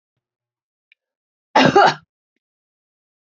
{"cough_length": "3.2 s", "cough_amplitude": 27861, "cough_signal_mean_std_ratio": 0.26, "survey_phase": "beta (2021-08-13 to 2022-03-07)", "age": "45-64", "gender": "Female", "wearing_mask": "No", "symptom_cough_any": true, "symptom_runny_or_blocked_nose": true, "symptom_sore_throat": true, "symptom_fatigue": true, "symptom_headache": true, "symptom_onset": "4 days", "smoker_status": "Ex-smoker", "respiratory_condition_asthma": false, "respiratory_condition_other": false, "recruitment_source": "Test and Trace", "submission_delay": "2 days", "covid_test_result": "Positive", "covid_test_method": "RT-qPCR", "covid_ct_value": 17.8, "covid_ct_gene": "ORF1ab gene"}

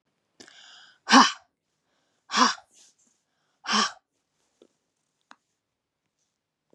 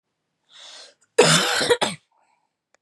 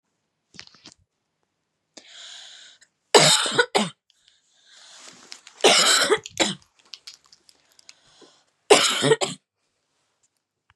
{"exhalation_length": "6.7 s", "exhalation_amplitude": 28074, "exhalation_signal_mean_std_ratio": 0.22, "cough_length": "2.8 s", "cough_amplitude": 26360, "cough_signal_mean_std_ratio": 0.39, "three_cough_length": "10.8 s", "three_cough_amplitude": 32395, "three_cough_signal_mean_std_ratio": 0.32, "survey_phase": "beta (2021-08-13 to 2022-03-07)", "age": "18-44", "gender": "Female", "wearing_mask": "No", "symptom_none": true, "smoker_status": "Never smoked", "respiratory_condition_asthma": false, "respiratory_condition_other": false, "recruitment_source": "REACT", "submission_delay": "0 days", "covid_test_result": "Negative", "covid_test_method": "RT-qPCR"}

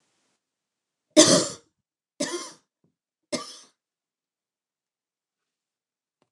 {"three_cough_length": "6.3 s", "three_cough_amplitude": 29203, "three_cough_signal_mean_std_ratio": 0.2, "survey_phase": "beta (2021-08-13 to 2022-03-07)", "age": "45-64", "gender": "Female", "wearing_mask": "No", "symptom_none": true, "smoker_status": "Never smoked", "respiratory_condition_asthma": false, "respiratory_condition_other": false, "recruitment_source": "REACT", "submission_delay": "1 day", "covid_test_result": "Negative", "covid_test_method": "RT-qPCR"}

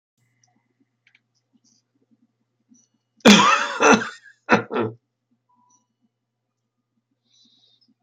{"cough_length": "8.0 s", "cough_amplitude": 32480, "cough_signal_mean_std_ratio": 0.25, "survey_phase": "beta (2021-08-13 to 2022-03-07)", "age": "65+", "gender": "Male", "wearing_mask": "No", "symptom_none": true, "smoker_status": "Never smoked", "respiratory_condition_asthma": false, "respiratory_condition_other": false, "recruitment_source": "REACT", "submission_delay": "4 days", "covid_test_result": "Negative", "covid_test_method": "RT-qPCR", "influenza_a_test_result": "Negative", "influenza_b_test_result": "Negative"}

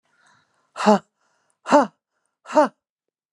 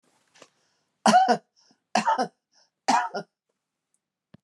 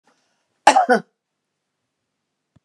{"exhalation_length": "3.3 s", "exhalation_amplitude": 28356, "exhalation_signal_mean_std_ratio": 0.28, "three_cough_length": "4.4 s", "three_cough_amplitude": 20570, "three_cough_signal_mean_std_ratio": 0.34, "cough_length": "2.6 s", "cough_amplitude": 32768, "cough_signal_mean_std_ratio": 0.24, "survey_phase": "beta (2021-08-13 to 2022-03-07)", "age": "65+", "gender": "Female", "wearing_mask": "No", "symptom_cough_any": true, "smoker_status": "Never smoked", "respiratory_condition_asthma": false, "respiratory_condition_other": false, "recruitment_source": "REACT", "submission_delay": "2 days", "covid_test_result": "Negative", "covid_test_method": "RT-qPCR"}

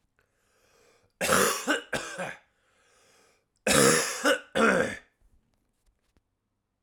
{"cough_length": "6.8 s", "cough_amplitude": 19698, "cough_signal_mean_std_ratio": 0.41, "survey_phase": "alpha (2021-03-01 to 2021-08-12)", "age": "18-44", "gender": "Male", "wearing_mask": "No", "symptom_cough_any": true, "symptom_shortness_of_breath": true, "symptom_change_to_sense_of_smell_or_taste": true, "symptom_loss_of_taste": true, "symptom_onset": "4 days", "smoker_status": "Never smoked", "respiratory_condition_asthma": false, "respiratory_condition_other": false, "recruitment_source": "Test and Trace", "submission_delay": "1 day", "covid_test_result": "Positive", "covid_test_method": "RT-qPCR", "covid_ct_value": 15.5, "covid_ct_gene": "ORF1ab gene"}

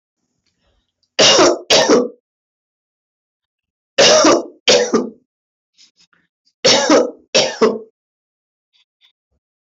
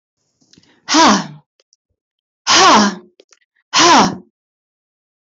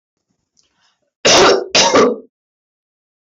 {"three_cough_length": "9.6 s", "three_cough_amplitude": 26901, "three_cough_signal_mean_std_ratio": 0.42, "exhalation_length": "5.3 s", "exhalation_amplitude": 27702, "exhalation_signal_mean_std_ratio": 0.43, "cough_length": "3.3 s", "cough_amplitude": 28293, "cough_signal_mean_std_ratio": 0.44, "survey_phase": "beta (2021-08-13 to 2022-03-07)", "age": "65+", "gender": "Female", "wearing_mask": "No", "symptom_headache": true, "symptom_onset": "12 days", "smoker_status": "Never smoked", "respiratory_condition_asthma": false, "respiratory_condition_other": false, "recruitment_source": "REACT", "submission_delay": "2 days", "covid_test_result": "Negative", "covid_test_method": "RT-qPCR"}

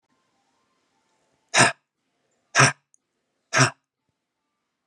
{"exhalation_length": "4.9 s", "exhalation_amplitude": 25810, "exhalation_signal_mean_std_ratio": 0.24, "survey_phase": "beta (2021-08-13 to 2022-03-07)", "age": "65+", "gender": "Male", "wearing_mask": "No", "symptom_sore_throat": true, "symptom_fatigue": true, "symptom_other": true, "symptom_onset": "11 days", "smoker_status": "Ex-smoker", "respiratory_condition_asthma": false, "respiratory_condition_other": false, "recruitment_source": "REACT", "submission_delay": "2 days", "covid_test_result": "Negative", "covid_test_method": "RT-qPCR", "influenza_a_test_result": "Negative", "influenza_b_test_result": "Negative"}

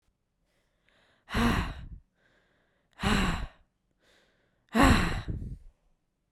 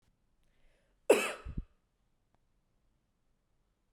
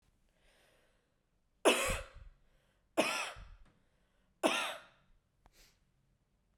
{"exhalation_length": "6.3 s", "exhalation_amplitude": 14703, "exhalation_signal_mean_std_ratio": 0.39, "cough_length": "3.9 s", "cough_amplitude": 8397, "cough_signal_mean_std_ratio": 0.19, "three_cough_length": "6.6 s", "three_cough_amplitude": 7304, "three_cough_signal_mean_std_ratio": 0.3, "survey_phase": "beta (2021-08-13 to 2022-03-07)", "age": "18-44", "gender": "Female", "wearing_mask": "No", "symptom_cough_any": true, "symptom_runny_or_blocked_nose": true, "symptom_fatigue": true, "symptom_onset": "2 days", "smoker_status": "Never smoked", "respiratory_condition_asthma": false, "respiratory_condition_other": false, "recruitment_source": "Test and Trace", "submission_delay": "1 day", "covid_test_result": "Positive", "covid_test_method": "RT-qPCR"}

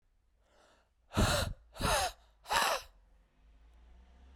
{"exhalation_length": "4.4 s", "exhalation_amplitude": 7267, "exhalation_signal_mean_std_ratio": 0.42, "survey_phase": "beta (2021-08-13 to 2022-03-07)", "age": "18-44", "gender": "Female", "wearing_mask": "No", "symptom_cough_any": true, "symptom_new_continuous_cough": true, "symptom_runny_or_blocked_nose": true, "symptom_shortness_of_breath": true, "symptom_sore_throat": true, "symptom_fatigue": true, "symptom_fever_high_temperature": true, "symptom_headache": true, "symptom_change_to_sense_of_smell_or_taste": true, "symptom_onset": "2 days", "smoker_status": "Current smoker (e-cigarettes or vapes only)", "respiratory_condition_asthma": true, "respiratory_condition_other": false, "recruitment_source": "Test and Trace", "submission_delay": "2 days", "covid_test_result": "Positive", "covid_test_method": "RT-qPCR", "covid_ct_value": 17.2, "covid_ct_gene": "ORF1ab gene", "covid_ct_mean": 17.8, "covid_viral_load": "1400000 copies/ml", "covid_viral_load_category": "High viral load (>1M copies/ml)"}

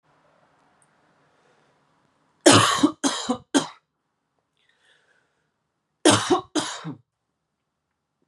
{"three_cough_length": "8.3 s", "three_cough_amplitude": 32425, "three_cough_signal_mean_std_ratio": 0.28, "survey_phase": "beta (2021-08-13 to 2022-03-07)", "age": "18-44", "gender": "Male", "wearing_mask": "No", "symptom_cough_any": true, "symptom_runny_or_blocked_nose": true, "symptom_fatigue": true, "symptom_fever_high_temperature": true, "symptom_change_to_sense_of_smell_or_taste": true, "symptom_loss_of_taste": true, "symptom_onset": "6 days", "smoker_status": "Never smoked", "respiratory_condition_asthma": false, "respiratory_condition_other": false, "recruitment_source": "Test and Trace", "submission_delay": "3 days", "covid_test_result": "Positive", "covid_test_method": "RT-qPCR", "covid_ct_value": 19.4, "covid_ct_gene": "ORF1ab gene", "covid_ct_mean": 20.6, "covid_viral_load": "170000 copies/ml", "covid_viral_load_category": "Low viral load (10K-1M copies/ml)"}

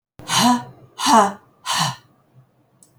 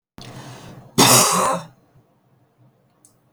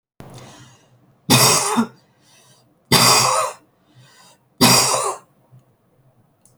{"exhalation_length": "3.0 s", "exhalation_amplitude": 27512, "exhalation_signal_mean_std_ratio": 0.45, "cough_length": "3.3 s", "cough_amplitude": 32768, "cough_signal_mean_std_ratio": 0.37, "three_cough_length": "6.6 s", "three_cough_amplitude": 32768, "three_cough_signal_mean_std_ratio": 0.42, "survey_phase": "beta (2021-08-13 to 2022-03-07)", "age": "45-64", "gender": "Female", "wearing_mask": "No", "symptom_runny_or_blocked_nose": true, "symptom_fatigue": true, "symptom_fever_high_temperature": true, "symptom_headache": true, "symptom_onset": "3 days", "smoker_status": "Ex-smoker", "respiratory_condition_asthma": false, "respiratory_condition_other": false, "recruitment_source": "Test and Trace", "submission_delay": "1 day", "covid_test_result": "Positive", "covid_test_method": "RT-qPCR", "covid_ct_value": 13.9, "covid_ct_gene": "S gene", "covid_ct_mean": 14.1, "covid_viral_load": "23000000 copies/ml", "covid_viral_load_category": "High viral load (>1M copies/ml)"}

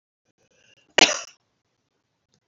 {"cough_length": "2.5 s", "cough_amplitude": 28864, "cough_signal_mean_std_ratio": 0.17, "survey_phase": "beta (2021-08-13 to 2022-03-07)", "age": "65+", "gender": "Female", "wearing_mask": "No", "symptom_none": true, "smoker_status": "Ex-smoker", "respiratory_condition_asthma": true, "respiratory_condition_other": true, "recruitment_source": "REACT", "submission_delay": "1 day", "covid_test_result": "Negative", "covid_test_method": "RT-qPCR", "influenza_a_test_result": "Negative", "influenza_b_test_result": "Negative"}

